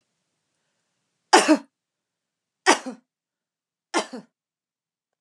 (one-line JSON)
{"three_cough_length": "5.2 s", "three_cough_amplitude": 32015, "three_cough_signal_mean_std_ratio": 0.22, "survey_phase": "beta (2021-08-13 to 2022-03-07)", "age": "45-64", "gender": "Female", "wearing_mask": "No", "symptom_none": true, "smoker_status": "Never smoked", "respiratory_condition_asthma": false, "respiratory_condition_other": false, "recruitment_source": "REACT", "submission_delay": "3 days", "covid_test_result": "Negative", "covid_test_method": "RT-qPCR"}